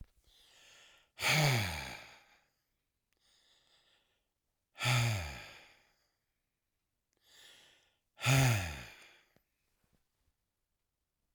{"exhalation_length": "11.3 s", "exhalation_amplitude": 5134, "exhalation_signal_mean_std_ratio": 0.33, "survey_phase": "alpha (2021-03-01 to 2021-08-12)", "age": "65+", "gender": "Male", "wearing_mask": "No", "symptom_none": true, "smoker_status": "Ex-smoker", "respiratory_condition_asthma": false, "respiratory_condition_other": true, "recruitment_source": "REACT", "submission_delay": "4 days", "covid_test_result": "Negative", "covid_test_method": "RT-qPCR"}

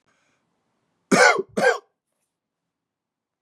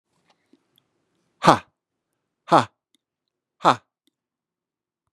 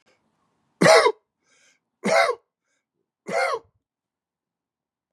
{"cough_length": "3.4 s", "cough_amplitude": 26225, "cough_signal_mean_std_ratio": 0.29, "exhalation_length": "5.1 s", "exhalation_amplitude": 32767, "exhalation_signal_mean_std_ratio": 0.17, "three_cough_length": "5.1 s", "three_cough_amplitude": 25420, "three_cough_signal_mean_std_ratio": 0.3, "survey_phase": "beta (2021-08-13 to 2022-03-07)", "age": "45-64", "gender": "Male", "wearing_mask": "No", "symptom_none": true, "smoker_status": "Never smoked", "respiratory_condition_asthma": false, "respiratory_condition_other": false, "recruitment_source": "REACT", "submission_delay": "1 day", "covid_test_result": "Negative", "covid_test_method": "RT-qPCR", "influenza_a_test_result": "Negative", "influenza_b_test_result": "Negative"}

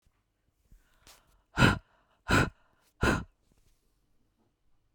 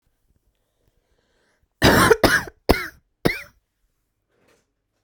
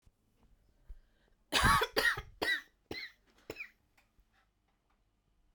{"exhalation_length": "4.9 s", "exhalation_amplitude": 13557, "exhalation_signal_mean_std_ratio": 0.27, "cough_length": "5.0 s", "cough_amplitude": 32768, "cough_signal_mean_std_ratio": 0.29, "three_cough_length": "5.5 s", "three_cough_amplitude": 6106, "three_cough_signal_mean_std_ratio": 0.33, "survey_phase": "beta (2021-08-13 to 2022-03-07)", "age": "18-44", "gender": "Female", "wearing_mask": "No", "symptom_cough_any": true, "symptom_sore_throat": true, "symptom_fatigue": true, "symptom_onset": "9 days", "smoker_status": "Never smoked", "respiratory_condition_asthma": true, "respiratory_condition_other": false, "recruitment_source": "REACT", "submission_delay": "1 day", "covid_test_result": "Negative", "covid_test_method": "RT-qPCR"}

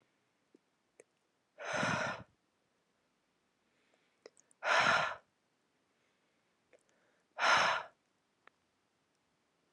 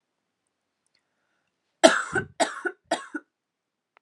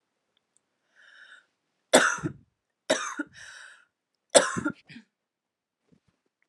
{"exhalation_length": "9.7 s", "exhalation_amplitude": 4941, "exhalation_signal_mean_std_ratio": 0.31, "cough_length": "4.0 s", "cough_amplitude": 31267, "cough_signal_mean_std_ratio": 0.24, "three_cough_length": "6.5 s", "three_cough_amplitude": 28084, "three_cough_signal_mean_std_ratio": 0.25, "survey_phase": "alpha (2021-03-01 to 2021-08-12)", "age": "18-44", "gender": "Female", "wearing_mask": "No", "symptom_cough_any": true, "symptom_shortness_of_breath": true, "symptom_fatigue": true, "symptom_fever_high_temperature": true, "symptom_headache": true, "symptom_loss_of_taste": true, "symptom_onset": "7 days", "smoker_status": "Never smoked", "respiratory_condition_asthma": false, "respiratory_condition_other": false, "recruitment_source": "Test and Trace", "submission_delay": "1 day", "covid_test_result": "Positive", "covid_test_method": "RT-qPCR", "covid_ct_value": 25.5, "covid_ct_gene": "ORF1ab gene", "covid_ct_mean": 26.3, "covid_viral_load": "2400 copies/ml", "covid_viral_load_category": "Minimal viral load (< 10K copies/ml)"}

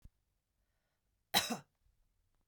{"cough_length": "2.5 s", "cough_amplitude": 5496, "cough_signal_mean_std_ratio": 0.21, "survey_phase": "beta (2021-08-13 to 2022-03-07)", "age": "45-64", "gender": "Female", "wearing_mask": "No", "symptom_none": true, "smoker_status": "Never smoked", "respiratory_condition_asthma": false, "respiratory_condition_other": false, "recruitment_source": "REACT", "submission_delay": "2 days", "covid_test_result": "Negative", "covid_test_method": "RT-qPCR", "influenza_a_test_result": "Negative", "influenza_b_test_result": "Negative"}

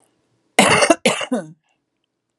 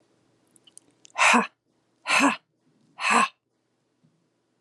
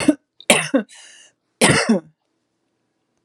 {"cough_length": "2.4 s", "cough_amplitude": 32768, "cough_signal_mean_std_ratio": 0.39, "exhalation_length": "4.6 s", "exhalation_amplitude": 15829, "exhalation_signal_mean_std_ratio": 0.34, "three_cough_length": "3.2 s", "three_cough_amplitude": 32768, "three_cough_signal_mean_std_ratio": 0.37, "survey_phase": "alpha (2021-03-01 to 2021-08-12)", "age": "45-64", "gender": "Female", "wearing_mask": "No", "symptom_none": true, "smoker_status": "Ex-smoker", "respiratory_condition_asthma": false, "respiratory_condition_other": false, "recruitment_source": "REACT", "submission_delay": "2 days", "covid_test_result": "Negative", "covid_test_method": "RT-qPCR"}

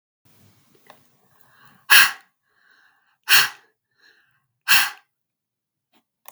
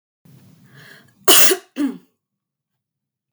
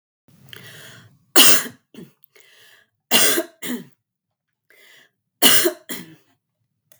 {"exhalation_length": "6.3 s", "exhalation_amplitude": 32768, "exhalation_signal_mean_std_ratio": 0.24, "cough_length": "3.3 s", "cough_amplitude": 32768, "cough_signal_mean_std_ratio": 0.29, "three_cough_length": "7.0 s", "three_cough_amplitude": 32768, "three_cough_signal_mean_std_ratio": 0.3, "survey_phase": "beta (2021-08-13 to 2022-03-07)", "age": "18-44", "gender": "Female", "wearing_mask": "No", "symptom_none": true, "symptom_onset": "12 days", "smoker_status": "Never smoked", "respiratory_condition_asthma": false, "respiratory_condition_other": false, "recruitment_source": "REACT", "submission_delay": "1 day", "covid_test_result": "Negative", "covid_test_method": "RT-qPCR", "influenza_a_test_result": "Negative", "influenza_b_test_result": "Negative"}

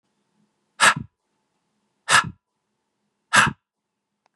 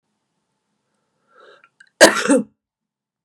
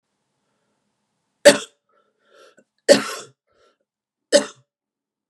{"exhalation_length": "4.4 s", "exhalation_amplitude": 27178, "exhalation_signal_mean_std_ratio": 0.26, "cough_length": "3.2 s", "cough_amplitude": 32768, "cough_signal_mean_std_ratio": 0.24, "three_cough_length": "5.3 s", "three_cough_amplitude": 32768, "three_cough_signal_mean_std_ratio": 0.19, "survey_phase": "beta (2021-08-13 to 2022-03-07)", "age": "45-64", "gender": "Female", "wearing_mask": "No", "symptom_cough_any": true, "symptom_runny_or_blocked_nose": true, "symptom_sore_throat": true, "symptom_fatigue": true, "symptom_onset": "4 days", "smoker_status": "Current smoker (e-cigarettes or vapes only)", "respiratory_condition_asthma": false, "respiratory_condition_other": false, "recruitment_source": "Test and Trace", "submission_delay": "2 days", "covid_test_result": "Positive", "covid_test_method": "RT-qPCR", "covid_ct_value": 16.0, "covid_ct_gene": "ORF1ab gene", "covid_ct_mean": 17.1, "covid_viral_load": "2400000 copies/ml", "covid_viral_load_category": "High viral load (>1M copies/ml)"}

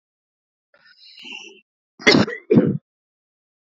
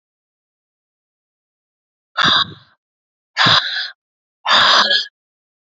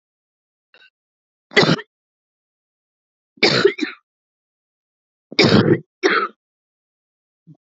{"cough_length": "3.8 s", "cough_amplitude": 28877, "cough_signal_mean_std_ratio": 0.3, "exhalation_length": "5.6 s", "exhalation_amplitude": 31321, "exhalation_signal_mean_std_ratio": 0.39, "three_cough_length": "7.7 s", "three_cough_amplitude": 29122, "three_cough_signal_mean_std_ratio": 0.31, "survey_phase": "beta (2021-08-13 to 2022-03-07)", "age": "45-64", "gender": "Female", "wearing_mask": "No", "symptom_cough_any": true, "symptom_runny_or_blocked_nose": true, "symptom_abdominal_pain": true, "symptom_fatigue": true, "symptom_fever_high_temperature": true, "symptom_headache": true, "symptom_onset": "4 days", "smoker_status": "Ex-smoker", "respiratory_condition_asthma": false, "respiratory_condition_other": false, "recruitment_source": "Test and Trace", "submission_delay": "2 days", "covid_test_result": "Positive", "covid_test_method": "RT-qPCR", "covid_ct_value": 11.5, "covid_ct_gene": "N gene", "covid_ct_mean": 12.2, "covid_viral_load": "100000000 copies/ml", "covid_viral_load_category": "High viral load (>1M copies/ml)"}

